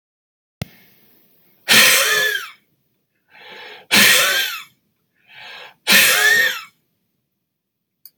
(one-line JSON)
{"exhalation_length": "8.2 s", "exhalation_amplitude": 32768, "exhalation_signal_mean_std_ratio": 0.42, "survey_phase": "beta (2021-08-13 to 2022-03-07)", "age": "65+", "gender": "Male", "wearing_mask": "No", "symptom_cough_any": true, "symptom_new_continuous_cough": true, "symptom_runny_or_blocked_nose": true, "symptom_shortness_of_breath": true, "symptom_sore_throat": true, "symptom_diarrhoea": true, "symptom_fatigue": true, "symptom_fever_high_temperature": true, "symptom_other": true, "symptom_onset": "3 days", "smoker_status": "Never smoked", "respiratory_condition_asthma": true, "respiratory_condition_other": false, "recruitment_source": "Test and Trace", "submission_delay": "1 day", "covid_test_result": "Positive", "covid_test_method": "RT-qPCR"}